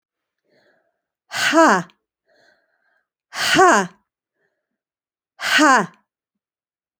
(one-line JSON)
{"exhalation_length": "7.0 s", "exhalation_amplitude": 28495, "exhalation_signal_mean_std_ratio": 0.34, "survey_phase": "alpha (2021-03-01 to 2021-08-12)", "age": "45-64", "gender": "Female", "wearing_mask": "No", "symptom_none": true, "smoker_status": "Never smoked", "respiratory_condition_asthma": false, "respiratory_condition_other": false, "recruitment_source": "REACT", "submission_delay": "1 day", "covid_test_result": "Negative", "covid_test_method": "RT-qPCR"}